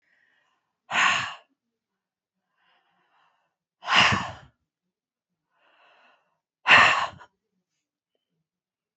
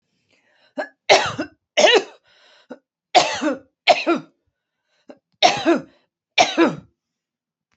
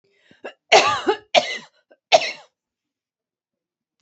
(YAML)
exhalation_length: 9.0 s
exhalation_amplitude: 26563
exhalation_signal_mean_std_ratio: 0.27
three_cough_length: 7.8 s
three_cough_amplitude: 32615
three_cough_signal_mean_std_ratio: 0.37
cough_length: 4.0 s
cough_amplitude: 32767
cough_signal_mean_std_ratio: 0.3
survey_phase: beta (2021-08-13 to 2022-03-07)
age: 65+
gender: Female
wearing_mask: 'No'
symptom_none: true
smoker_status: Never smoked
respiratory_condition_asthma: false
respiratory_condition_other: false
recruitment_source: REACT
submission_delay: 1 day
covid_test_result: Negative
covid_test_method: RT-qPCR